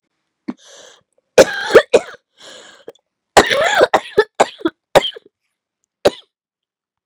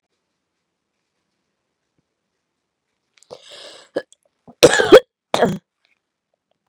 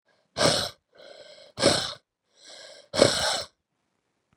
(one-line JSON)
{"three_cough_length": "7.1 s", "three_cough_amplitude": 32768, "three_cough_signal_mean_std_ratio": 0.31, "cough_length": "6.7 s", "cough_amplitude": 32768, "cough_signal_mean_std_ratio": 0.19, "exhalation_length": "4.4 s", "exhalation_amplitude": 30348, "exhalation_signal_mean_std_ratio": 0.37, "survey_phase": "beta (2021-08-13 to 2022-03-07)", "age": "18-44", "gender": "Female", "wearing_mask": "No", "symptom_cough_any": true, "symptom_sore_throat": true, "symptom_headache": true, "symptom_change_to_sense_of_smell_or_taste": true, "smoker_status": "Ex-smoker", "respiratory_condition_asthma": false, "respiratory_condition_other": false, "recruitment_source": "Test and Trace", "submission_delay": "3 days", "covid_test_result": "Positive", "covid_test_method": "RT-qPCR", "covid_ct_value": 20.1, "covid_ct_gene": "ORF1ab gene", "covid_ct_mean": 20.6, "covid_viral_load": "170000 copies/ml", "covid_viral_load_category": "Low viral load (10K-1M copies/ml)"}